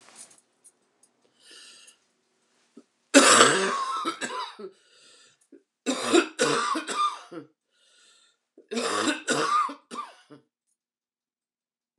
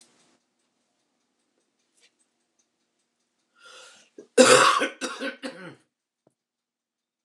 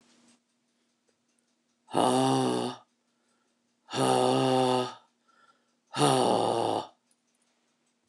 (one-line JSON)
{"three_cough_length": "12.0 s", "three_cough_amplitude": 28050, "three_cough_signal_mean_std_ratio": 0.38, "cough_length": "7.2 s", "cough_amplitude": 25683, "cough_signal_mean_std_ratio": 0.23, "exhalation_length": "8.1 s", "exhalation_amplitude": 12701, "exhalation_signal_mean_std_ratio": 0.47, "survey_phase": "beta (2021-08-13 to 2022-03-07)", "age": "45-64", "gender": "Female", "wearing_mask": "No", "symptom_cough_any": true, "symptom_new_continuous_cough": true, "symptom_runny_or_blocked_nose": true, "symptom_shortness_of_breath": true, "symptom_sore_throat": true, "symptom_other": true, "symptom_onset": "3 days", "smoker_status": "Never smoked", "respiratory_condition_asthma": false, "respiratory_condition_other": false, "recruitment_source": "Test and Trace", "submission_delay": "2 days", "covid_test_result": "Positive", "covid_test_method": "ePCR"}